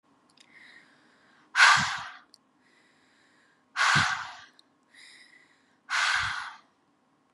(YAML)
exhalation_length: 7.3 s
exhalation_amplitude: 17477
exhalation_signal_mean_std_ratio: 0.34
survey_phase: beta (2021-08-13 to 2022-03-07)
age: 18-44
gender: Female
wearing_mask: 'No'
symptom_cough_any: true
symptom_runny_or_blocked_nose: true
symptom_shortness_of_breath: true
symptom_sore_throat: true
symptom_fatigue: true
symptom_other: true
symptom_onset: 5 days
smoker_status: Never smoked
respiratory_condition_asthma: true
respiratory_condition_other: false
recruitment_source: Test and Trace
submission_delay: 1 day
covid_test_result: Positive
covid_test_method: RT-qPCR
covid_ct_value: 26.8
covid_ct_gene: N gene